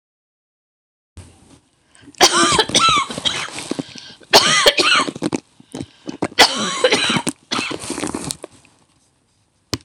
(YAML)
three_cough_length: 9.8 s
three_cough_amplitude: 26028
three_cough_signal_mean_std_ratio: 0.46
survey_phase: beta (2021-08-13 to 2022-03-07)
age: 45-64
gender: Female
wearing_mask: 'No'
symptom_none: true
smoker_status: Never smoked
respiratory_condition_asthma: false
respiratory_condition_other: false
recruitment_source: REACT
submission_delay: 2 days
covid_test_result: Negative
covid_test_method: RT-qPCR